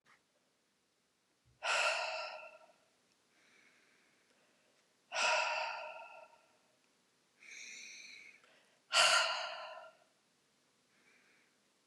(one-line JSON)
{"exhalation_length": "11.9 s", "exhalation_amplitude": 6729, "exhalation_signal_mean_std_ratio": 0.35, "survey_phase": "beta (2021-08-13 to 2022-03-07)", "age": "45-64", "gender": "Female", "wearing_mask": "No", "symptom_cough_any": true, "symptom_onset": "4 days", "smoker_status": "Never smoked", "respiratory_condition_asthma": false, "respiratory_condition_other": false, "recruitment_source": "Test and Trace", "submission_delay": "2 days", "covid_test_result": "Positive", "covid_test_method": "RT-qPCR", "covid_ct_value": 23.1, "covid_ct_gene": "ORF1ab gene"}